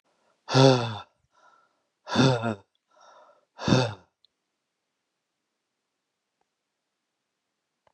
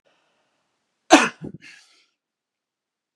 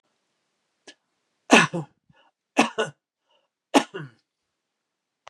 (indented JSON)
{
  "exhalation_length": "7.9 s",
  "exhalation_amplitude": 21602,
  "exhalation_signal_mean_std_ratio": 0.27,
  "cough_length": "3.2 s",
  "cough_amplitude": 32767,
  "cough_signal_mean_std_ratio": 0.18,
  "three_cough_length": "5.3 s",
  "three_cough_amplitude": 32734,
  "three_cough_signal_mean_std_ratio": 0.22,
  "survey_phase": "beta (2021-08-13 to 2022-03-07)",
  "age": "45-64",
  "gender": "Male",
  "wearing_mask": "No",
  "symptom_none": true,
  "smoker_status": "Ex-smoker",
  "respiratory_condition_asthma": false,
  "respiratory_condition_other": false,
  "recruitment_source": "REACT",
  "submission_delay": "8 days",
  "covid_test_result": "Negative",
  "covid_test_method": "RT-qPCR",
  "influenza_a_test_result": "Negative",
  "influenza_b_test_result": "Negative"
}